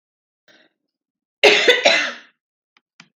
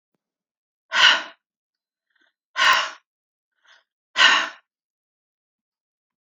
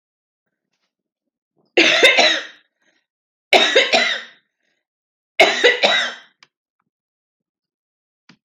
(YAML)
cough_length: 3.2 s
cough_amplitude: 30923
cough_signal_mean_std_ratio: 0.34
exhalation_length: 6.2 s
exhalation_amplitude: 28264
exhalation_signal_mean_std_ratio: 0.29
three_cough_length: 8.4 s
three_cough_amplitude: 32768
three_cough_signal_mean_std_ratio: 0.37
survey_phase: beta (2021-08-13 to 2022-03-07)
age: 65+
gender: Female
wearing_mask: 'No'
symptom_none: true
smoker_status: Never smoked
respiratory_condition_asthma: false
respiratory_condition_other: false
recruitment_source: REACT
submission_delay: 3 days
covid_test_result: Negative
covid_test_method: RT-qPCR